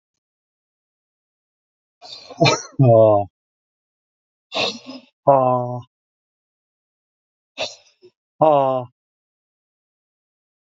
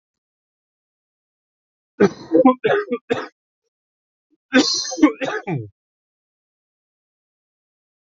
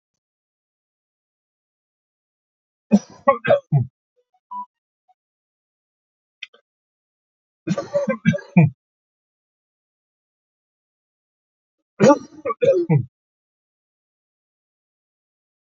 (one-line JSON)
{"exhalation_length": "10.8 s", "exhalation_amplitude": 27435, "exhalation_signal_mean_std_ratio": 0.32, "cough_length": "8.2 s", "cough_amplitude": 26885, "cough_signal_mean_std_ratio": 0.31, "three_cough_length": "15.6 s", "three_cough_amplitude": 26453, "three_cough_signal_mean_std_ratio": 0.25, "survey_phase": "alpha (2021-03-01 to 2021-08-12)", "age": "45-64", "gender": "Male", "wearing_mask": "No", "symptom_none": true, "smoker_status": "Ex-smoker", "respiratory_condition_asthma": false, "respiratory_condition_other": true, "recruitment_source": "REACT", "submission_delay": "1 day", "covid_test_result": "Negative", "covid_test_method": "RT-qPCR"}